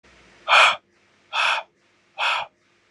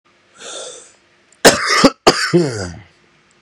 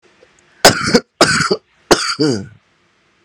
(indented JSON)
{
  "exhalation_length": "2.9 s",
  "exhalation_amplitude": 29029,
  "exhalation_signal_mean_std_ratio": 0.4,
  "cough_length": "3.4 s",
  "cough_amplitude": 32768,
  "cough_signal_mean_std_ratio": 0.41,
  "three_cough_length": "3.2 s",
  "three_cough_amplitude": 32768,
  "three_cough_signal_mean_std_ratio": 0.43,
  "survey_phase": "beta (2021-08-13 to 2022-03-07)",
  "age": "18-44",
  "gender": "Male",
  "wearing_mask": "No",
  "symptom_cough_any": true,
  "symptom_runny_or_blocked_nose": true,
  "symptom_onset": "8 days",
  "smoker_status": "Current smoker (e-cigarettes or vapes only)",
  "respiratory_condition_asthma": true,
  "respiratory_condition_other": false,
  "recruitment_source": "REACT",
  "submission_delay": "1 day",
  "covid_test_result": "Negative",
  "covid_test_method": "RT-qPCR",
  "influenza_a_test_result": "Negative",
  "influenza_b_test_result": "Negative"
}